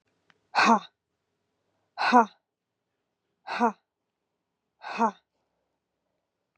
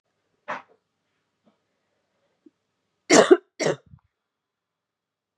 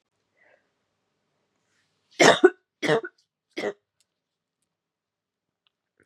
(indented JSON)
{
  "exhalation_length": "6.6 s",
  "exhalation_amplitude": 16593,
  "exhalation_signal_mean_std_ratio": 0.26,
  "cough_length": "5.4 s",
  "cough_amplitude": 28511,
  "cough_signal_mean_std_ratio": 0.19,
  "three_cough_length": "6.1 s",
  "three_cough_amplitude": 27656,
  "three_cough_signal_mean_std_ratio": 0.2,
  "survey_phase": "beta (2021-08-13 to 2022-03-07)",
  "age": "18-44",
  "gender": "Female",
  "wearing_mask": "No",
  "symptom_cough_any": true,
  "symptom_runny_or_blocked_nose": true,
  "symptom_shortness_of_breath": true,
  "symptom_sore_throat": true,
  "symptom_fever_high_temperature": true,
  "symptom_headache": true,
  "symptom_onset": "3 days",
  "smoker_status": "Current smoker (1 to 10 cigarettes per day)",
  "respiratory_condition_asthma": true,
  "respiratory_condition_other": false,
  "recruitment_source": "Test and Trace",
  "submission_delay": "2 days",
  "covid_test_result": "Positive",
  "covid_test_method": "LAMP"
}